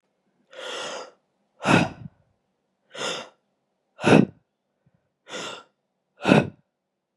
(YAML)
exhalation_length: 7.2 s
exhalation_amplitude: 31821
exhalation_signal_mean_std_ratio: 0.28
survey_phase: beta (2021-08-13 to 2022-03-07)
age: 18-44
gender: Female
wearing_mask: 'No'
symptom_cough_any: true
symptom_runny_or_blocked_nose: true
symptom_headache: true
symptom_onset: 2 days
smoker_status: Never smoked
respiratory_condition_asthma: false
respiratory_condition_other: false
recruitment_source: Test and Trace
submission_delay: 1 day
covid_test_result: Positive
covid_test_method: RT-qPCR
covid_ct_value: 17.1
covid_ct_gene: N gene